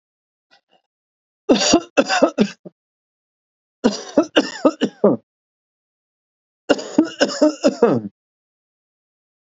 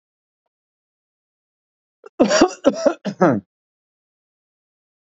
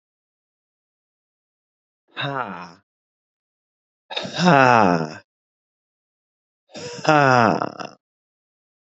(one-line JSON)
{"three_cough_length": "9.5 s", "three_cough_amplitude": 32767, "three_cough_signal_mean_std_ratio": 0.35, "cough_length": "5.1 s", "cough_amplitude": 32767, "cough_signal_mean_std_ratio": 0.28, "exhalation_length": "8.9 s", "exhalation_amplitude": 29635, "exhalation_signal_mean_std_ratio": 0.3, "survey_phase": "alpha (2021-03-01 to 2021-08-12)", "age": "45-64", "gender": "Male", "wearing_mask": "No", "symptom_none": true, "smoker_status": "Ex-smoker", "respiratory_condition_asthma": false, "respiratory_condition_other": false, "recruitment_source": "REACT", "submission_delay": "1 day", "covid_test_result": "Negative", "covid_test_method": "RT-qPCR"}